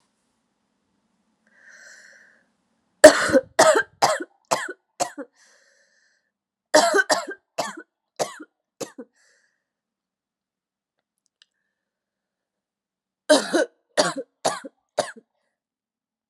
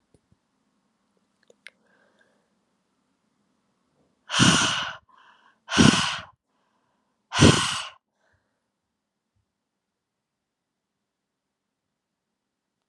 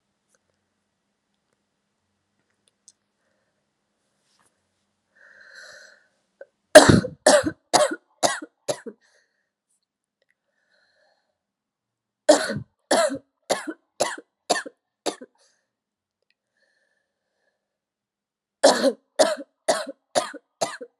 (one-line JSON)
{"cough_length": "16.3 s", "cough_amplitude": 32768, "cough_signal_mean_std_ratio": 0.25, "exhalation_length": "12.9 s", "exhalation_amplitude": 29309, "exhalation_signal_mean_std_ratio": 0.24, "three_cough_length": "21.0 s", "three_cough_amplitude": 32768, "three_cough_signal_mean_std_ratio": 0.23, "survey_phase": "alpha (2021-03-01 to 2021-08-12)", "age": "18-44", "gender": "Female", "wearing_mask": "No", "symptom_cough_any": true, "symptom_new_continuous_cough": true, "symptom_shortness_of_breath": true, "symptom_abdominal_pain": true, "symptom_diarrhoea": true, "symptom_fatigue": true, "symptom_fever_high_temperature": true, "symptom_headache": true, "symptom_change_to_sense_of_smell_or_taste": true, "symptom_loss_of_taste": true, "symptom_onset": "4 days", "smoker_status": "Current smoker (e-cigarettes or vapes only)", "recruitment_source": "Test and Trace", "submission_delay": "1 day", "covid_test_result": "Positive", "covid_test_method": "RT-qPCR", "covid_ct_value": 12.4, "covid_ct_gene": "ORF1ab gene", "covid_ct_mean": 12.8, "covid_viral_load": "65000000 copies/ml", "covid_viral_load_category": "High viral load (>1M copies/ml)"}